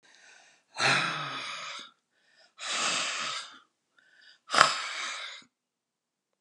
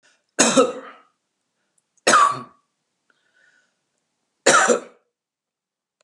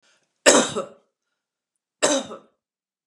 {"exhalation_length": "6.4 s", "exhalation_amplitude": 32767, "exhalation_signal_mean_std_ratio": 0.43, "cough_length": "6.0 s", "cough_amplitude": 32134, "cough_signal_mean_std_ratio": 0.32, "three_cough_length": "3.1 s", "three_cough_amplitude": 32767, "three_cough_signal_mean_std_ratio": 0.3, "survey_phase": "alpha (2021-03-01 to 2021-08-12)", "age": "65+", "gender": "Female", "wearing_mask": "No", "symptom_none": true, "smoker_status": "Never smoked", "respiratory_condition_asthma": false, "respiratory_condition_other": false, "recruitment_source": "REACT", "submission_delay": "1 day", "covid_test_result": "Negative", "covid_test_method": "RT-qPCR"}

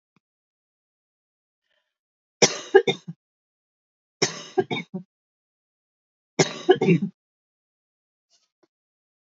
{"three_cough_length": "9.4 s", "three_cough_amplitude": 28635, "three_cough_signal_mean_std_ratio": 0.23, "survey_phase": "beta (2021-08-13 to 2022-03-07)", "age": "45-64", "gender": "Female", "wearing_mask": "No", "symptom_none": true, "smoker_status": "Ex-smoker", "respiratory_condition_asthma": false, "respiratory_condition_other": false, "recruitment_source": "REACT", "submission_delay": "1 day", "covid_test_result": "Negative", "covid_test_method": "RT-qPCR", "influenza_a_test_result": "Negative", "influenza_b_test_result": "Negative"}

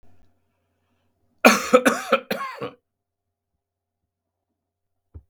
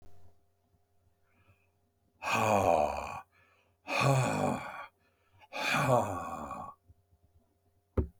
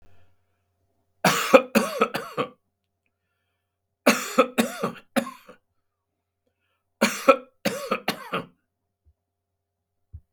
{"cough_length": "5.3 s", "cough_amplitude": 32768, "cough_signal_mean_std_ratio": 0.25, "exhalation_length": "8.2 s", "exhalation_amplitude": 6540, "exhalation_signal_mean_std_ratio": 0.47, "three_cough_length": "10.3 s", "three_cough_amplitude": 32768, "three_cough_signal_mean_std_ratio": 0.3, "survey_phase": "beta (2021-08-13 to 2022-03-07)", "age": "65+", "gender": "Male", "wearing_mask": "No", "symptom_none": true, "symptom_onset": "7 days", "smoker_status": "Never smoked", "respiratory_condition_asthma": false, "respiratory_condition_other": true, "recruitment_source": "REACT", "submission_delay": "2 days", "covid_test_result": "Negative", "covid_test_method": "RT-qPCR", "influenza_a_test_result": "Negative", "influenza_b_test_result": "Negative"}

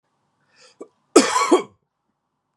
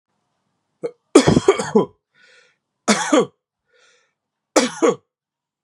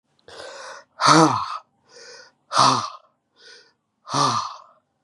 {"cough_length": "2.6 s", "cough_amplitude": 32767, "cough_signal_mean_std_ratio": 0.3, "three_cough_length": "5.6 s", "three_cough_amplitude": 32768, "three_cough_signal_mean_std_ratio": 0.33, "exhalation_length": "5.0 s", "exhalation_amplitude": 29257, "exhalation_signal_mean_std_ratio": 0.4, "survey_phase": "beta (2021-08-13 to 2022-03-07)", "age": "18-44", "gender": "Male", "wearing_mask": "No", "symptom_cough_any": true, "symptom_runny_or_blocked_nose": true, "symptom_fatigue": true, "symptom_fever_high_temperature": true, "symptom_change_to_sense_of_smell_or_taste": true, "symptom_loss_of_taste": true, "symptom_onset": "2 days", "smoker_status": "Current smoker (1 to 10 cigarettes per day)", "respiratory_condition_asthma": false, "respiratory_condition_other": false, "recruitment_source": "Test and Trace", "submission_delay": "2 days", "covid_test_result": "Positive", "covid_test_method": "ePCR"}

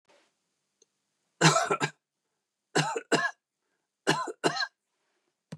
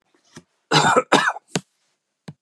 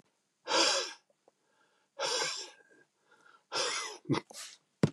{"three_cough_length": "5.6 s", "three_cough_amplitude": 14824, "three_cough_signal_mean_std_ratio": 0.35, "cough_length": "2.4 s", "cough_amplitude": 30142, "cough_signal_mean_std_ratio": 0.38, "exhalation_length": "4.9 s", "exhalation_amplitude": 7867, "exhalation_signal_mean_std_ratio": 0.43, "survey_phase": "beta (2021-08-13 to 2022-03-07)", "age": "65+", "gender": "Male", "wearing_mask": "No", "symptom_none": true, "smoker_status": "Never smoked", "respiratory_condition_asthma": false, "respiratory_condition_other": false, "recruitment_source": "REACT", "submission_delay": "0 days", "covid_test_result": "Negative", "covid_test_method": "RT-qPCR", "influenza_a_test_result": "Negative", "influenza_b_test_result": "Negative"}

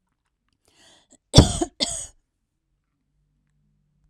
{"cough_length": "4.1 s", "cough_amplitude": 32768, "cough_signal_mean_std_ratio": 0.19, "survey_phase": "beta (2021-08-13 to 2022-03-07)", "age": "45-64", "gender": "Female", "wearing_mask": "No", "symptom_none": true, "smoker_status": "Never smoked", "respiratory_condition_asthma": false, "respiratory_condition_other": false, "recruitment_source": "REACT", "submission_delay": "2 days", "covid_test_result": "Negative", "covid_test_method": "RT-qPCR"}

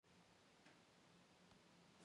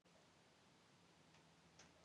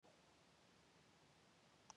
{"exhalation_length": "2.0 s", "exhalation_amplitude": 61, "exhalation_signal_mean_std_ratio": 1.17, "cough_length": "2.0 s", "cough_amplitude": 100, "cough_signal_mean_std_ratio": 1.13, "three_cough_length": "2.0 s", "three_cough_amplitude": 345, "three_cough_signal_mean_std_ratio": 0.93, "survey_phase": "beta (2021-08-13 to 2022-03-07)", "age": "65+", "gender": "Female", "wearing_mask": "No", "symptom_none": true, "smoker_status": "Never smoked", "respiratory_condition_asthma": false, "respiratory_condition_other": false, "recruitment_source": "REACT", "submission_delay": "2 days", "covid_test_result": "Negative", "covid_test_method": "RT-qPCR", "influenza_a_test_result": "Negative", "influenza_b_test_result": "Negative"}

